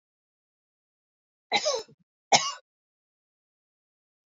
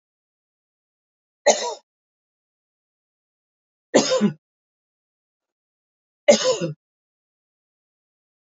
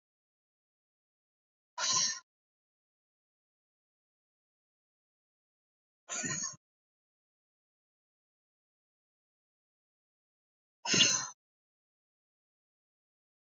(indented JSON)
{
  "cough_length": "4.3 s",
  "cough_amplitude": 23338,
  "cough_signal_mean_std_ratio": 0.23,
  "three_cough_length": "8.5 s",
  "three_cough_amplitude": 26972,
  "three_cough_signal_mean_std_ratio": 0.24,
  "exhalation_length": "13.5 s",
  "exhalation_amplitude": 8214,
  "exhalation_signal_mean_std_ratio": 0.21,
  "survey_phase": "beta (2021-08-13 to 2022-03-07)",
  "age": "65+",
  "gender": "Female",
  "wearing_mask": "No",
  "symptom_none": true,
  "smoker_status": "Ex-smoker",
  "respiratory_condition_asthma": false,
  "respiratory_condition_other": false,
  "recruitment_source": "REACT",
  "submission_delay": "2 days",
  "covid_test_result": "Negative",
  "covid_test_method": "RT-qPCR",
  "influenza_a_test_result": "Negative",
  "influenza_b_test_result": "Negative"
}